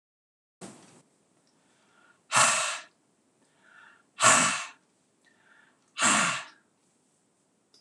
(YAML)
exhalation_length: 7.8 s
exhalation_amplitude: 16590
exhalation_signal_mean_std_ratio: 0.32
survey_phase: beta (2021-08-13 to 2022-03-07)
age: 65+
gender: Male
wearing_mask: 'No'
symptom_none: true
smoker_status: Never smoked
respiratory_condition_asthma: false
respiratory_condition_other: false
recruitment_source: REACT
submission_delay: 1 day
covid_test_result: Negative
covid_test_method: RT-qPCR